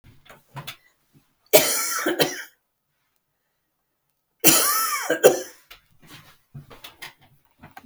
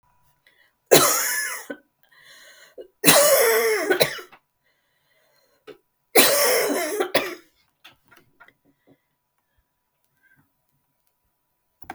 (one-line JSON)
{"cough_length": "7.9 s", "cough_amplitude": 32768, "cough_signal_mean_std_ratio": 0.34, "three_cough_length": "11.9 s", "three_cough_amplitude": 32768, "three_cough_signal_mean_std_ratio": 0.37, "survey_phase": "beta (2021-08-13 to 2022-03-07)", "age": "45-64", "gender": "Female", "wearing_mask": "No", "symptom_none": true, "smoker_status": "Never smoked", "respiratory_condition_asthma": false, "respiratory_condition_other": false, "recruitment_source": "REACT", "submission_delay": "1 day", "covid_test_result": "Negative", "covid_test_method": "RT-qPCR", "influenza_a_test_result": "Negative", "influenza_b_test_result": "Negative"}